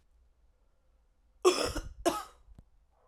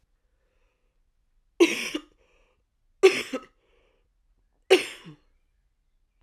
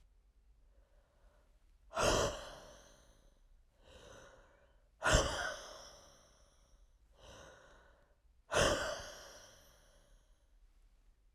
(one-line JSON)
{"cough_length": "3.1 s", "cough_amplitude": 9218, "cough_signal_mean_std_ratio": 0.31, "three_cough_length": "6.2 s", "three_cough_amplitude": 23717, "three_cough_signal_mean_std_ratio": 0.22, "exhalation_length": "11.3 s", "exhalation_amplitude": 6688, "exhalation_signal_mean_std_ratio": 0.33, "survey_phase": "alpha (2021-03-01 to 2021-08-12)", "age": "45-64", "gender": "Female", "wearing_mask": "No", "symptom_cough_any": true, "symptom_fatigue": true, "symptom_fever_high_temperature": true, "symptom_headache": true, "symptom_change_to_sense_of_smell_or_taste": true, "symptom_onset": "3 days", "smoker_status": "Ex-smoker", "respiratory_condition_asthma": true, "respiratory_condition_other": false, "recruitment_source": "Test and Trace", "submission_delay": "2 days", "covid_test_result": "Positive", "covid_test_method": "RT-qPCR", "covid_ct_value": 13.5, "covid_ct_gene": "ORF1ab gene", "covid_ct_mean": 14.2, "covid_viral_load": "23000000 copies/ml", "covid_viral_load_category": "High viral load (>1M copies/ml)"}